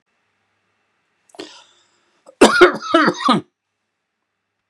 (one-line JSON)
{"cough_length": "4.7 s", "cough_amplitude": 32768, "cough_signal_mean_std_ratio": 0.3, "survey_phase": "beta (2021-08-13 to 2022-03-07)", "age": "65+", "gender": "Male", "wearing_mask": "No", "symptom_none": true, "smoker_status": "Never smoked", "respiratory_condition_asthma": false, "respiratory_condition_other": false, "recruitment_source": "REACT", "submission_delay": "1 day", "covid_test_result": "Negative", "covid_test_method": "RT-qPCR"}